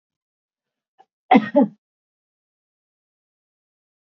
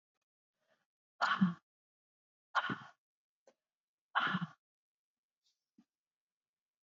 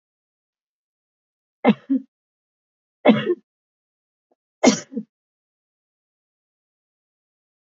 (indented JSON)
{
  "cough_length": "4.2 s",
  "cough_amplitude": 26565,
  "cough_signal_mean_std_ratio": 0.19,
  "exhalation_length": "6.8 s",
  "exhalation_amplitude": 3513,
  "exhalation_signal_mean_std_ratio": 0.26,
  "three_cough_length": "7.8 s",
  "three_cough_amplitude": 27914,
  "three_cough_signal_mean_std_ratio": 0.21,
  "survey_phase": "beta (2021-08-13 to 2022-03-07)",
  "age": "65+",
  "gender": "Female",
  "wearing_mask": "No",
  "symptom_none": true,
  "smoker_status": "Ex-smoker",
  "respiratory_condition_asthma": false,
  "respiratory_condition_other": false,
  "recruitment_source": "REACT",
  "submission_delay": "1 day",
  "covid_test_result": "Negative",
  "covid_test_method": "RT-qPCR",
  "influenza_a_test_result": "Negative",
  "influenza_b_test_result": "Negative"
}